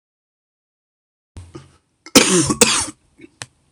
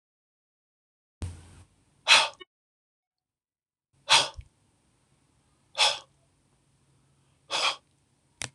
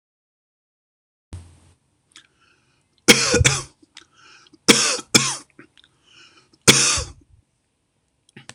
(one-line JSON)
{"cough_length": "3.7 s", "cough_amplitude": 26028, "cough_signal_mean_std_ratio": 0.32, "exhalation_length": "8.5 s", "exhalation_amplitude": 20995, "exhalation_signal_mean_std_ratio": 0.24, "three_cough_length": "8.5 s", "three_cough_amplitude": 26028, "three_cough_signal_mean_std_ratio": 0.29, "survey_phase": "beta (2021-08-13 to 2022-03-07)", "age": "45-64", "gender": "Male", "wearing_mask": "No", "symptom_cough_any": true, "symptom_runny_or_blocked_nose": true, "smoker_status": "Never smoked", "respiratory_condition_asthma": false, "respiratory_condition_other": false, "recruitment_source": "REACT", "submission_delay": "0 days", "covid_test_result": "Negative", "covid_test_method": "RT-qPCR"}